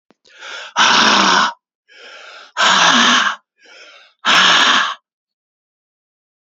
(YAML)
exhalation_length: 6.6 s
exhalation_amplitude: 32768
exhalation_signal_mean_std_ratio: 0.52
survey_phase: beta (2021-08-13 to 2022-03-07)
age: 45-64
gender: Male
wearing_mask: 'No'
symptom_cough_any: true
symptom_runny_or_blocked_nose: true
symptom_sore_throat: true
symptom_onset: 2 days
smoker_status: Never smoked
respiratory_condition_asthma: false
respiratory_condition_other: false
recruitment_source: Test and Trace
submission_delay: 1 day
covid_test_result: Positive
covid_test_method: RT-qPCR
covid_ct_value: 13.8
covid_ct_gene: ORF1ab gene